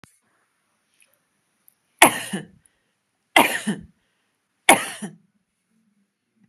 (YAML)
three_cough_length: 6.5 s
three_cough_amplitude: 32768
three_cough_signal_mean_std_ratio: 0.22
survey_phase: beta (2021-08-13 to 2022-03-07)
age: 45-64
gender: Female
wearing_mask: 'No'
symptom_none: true
smoker_status: Never smoked
respiratory_condition_asthma: false
respiratory_condition_other: false
recruitment_source: REACT
submission_delay: 1 day
covid_test_result: Negative
covid_test_method: RT-qPCR
influenza_a_test_result: Unknown/Void
influenza_b_test_result: Unknown/Void